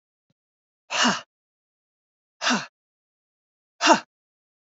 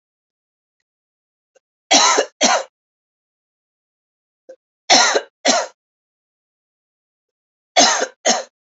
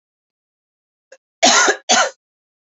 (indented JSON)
{
  "exhalation_length": "4.8 s",
  "exhalation_amplitude": 25185,
  "exhalation_signal_mean_std_ratio": 0.26,
  "three_cough_length": "8.6 s",
  "three_cough_amplitude": 32768,
  "three_cough_signal_mean_std_ratio": 0.33,
  "cough_length": "2.6 s",
  "cough_amplitude": 31215,
  "cough_signal_mean_std_ratio": 0.36,
  "survey_phase": "beta (2021-08-13 to 2022-03-07)",
  "age": "45-64",
  "gender": "Female",
  "wearing_mask": "No",
  "symptom_cough_any": true,
  "symptom_runny_or_blocked_nose": true,
  "symptom_sore_throat": true,
  "symptom_fatigue": true,
  "symptom_headache": true,
  "symptom_change_to_sense_of_smell_or_taste": true,
  "symptom_loss_of_taste": true,
  "symptom_onset": "4 days",
  "smoker_status": "Ex-smoker",
  "respiratory_condition_asthma": false,
  "respiratory_condition_other": false,
  "recruitment_source": "Test and Trace",
  "submission_delay": "2 days",
  "covid_test_result": "Positive",
  "covid_test_method": "RT-qPCR",
  "covid_ct_value": 33.4,
  "covid_ct_gene": "ORF1ab gene"
}